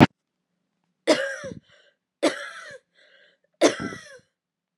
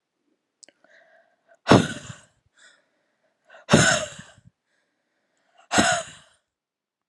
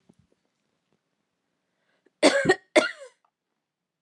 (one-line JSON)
{"three_cough_length": "4.8 s", "three_cough_amplitude": 32768, "three_cough_signal_mean_std_ratio": 0.27, "exhalation_length": "7.1 s", "exhalation_amplitude": 28602, "exhalation_signal_mean_std_ratio": 0.27, "cough_length": "4.0 s", "cough_amplitude": 20150, "cough_signal_mean_std_ratio": 0.24, "survey_phase": "beta (2021-08-13 to 2022-03-07)", "age": "18-44", "gender": "Female", "wearing_mask": "No", "symptom_cough_any": true, "symptom_runny_or_blocked_nose": true, "symptom_sore_throat": true, "symptom_fatigue": true, "symptom_headache": true, "smoker_status": "Never smoked", "respiratory_condition_asthma": true, "respiratory_condition_other": false, "recruitment_source": "Test and Trace", "submission_delay": "2 days", "covid_test_result": "Positive", "covid_test_method": "RT-qPCR", "covid_ct_value": 25.2, "covid_ct_gene": "ORF1ab gene", "covid_ct_mean": 25.9, "covid_viral_load": "3300 copies/ml", "covid_viral_load_category": "Minimal viral load (< 10K copies/ml)"}